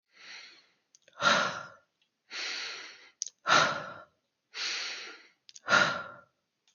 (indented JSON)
{
  "exhalation_length": "6.7 s",
  "exhalation_amplitude": 11121,
  "exhalation_signal_mean_std_ratio": 0.4,
  "survey_phase": "beta (2021-08-13 to 2022-03-07)",
  "age": "18-44",
  "gender": "Male",
  "wearing_mask": "No",
  "symptom_cough_any": true,
  "symptom_sore_throat": true,
  "symptom_onset": "3 days",
  "smoker_status": "Never smoked",
  "respiratory_condition_asthma": false,
  "respiratory_condition_other": false,
  "recruitment_source": "Test and Trace",
  "submission_delay": "0 days",
  "covid_test_result": "Positive",
  "covid_test_method": "RT-qPCR",
  "covid_ct_value": 26.1,
  "covid_ct_gene": "N gene"
}